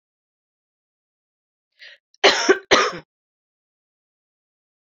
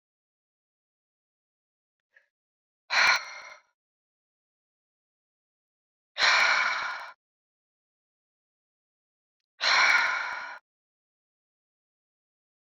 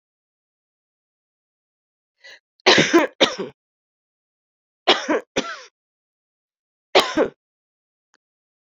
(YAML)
cough_length: 4.9 s
cough_amplitude: 29022
cough_signal_mean_std_ratio: 0.24
exhalation_length: 12.6 s
exhalation_amplitude: 12819
exhalation_signal_mean_std_ratio: 0.3
three_cough_length: 8.7 s
three_cough_amplitude: 30127
three_cough_signal_mean_std_ratio: 0.27
survey_phase: beta (2021-08-13 to 2022-03-07)
age: 45-64
gender: Female
wearing_mask: 'No'
symptom_cough_any: true
symptom_runny_or_blocked_nose: true
symptom_headache: true
symptom_change_to_sense_of_smell_or_taste: true
symptom_loss_of_taste: true
symptom_onset: 4 days
smoker_status: Never smoked
respiratory_condition_asthma: false
respiratory_condition_other: false
recruitment_source: Test and Trace
submission_delay: 2 days
covid_test_result: Positive
covid_test_method: RT-qPCR
covid_ct_value: 21.6
covid_ct_gene: ORF1ab gene
covid_ct_mean: 22.8
covid_viral_load: 33000 copies/ml
covid_viral_load_category: Low viral load (10K-1M copies/ml)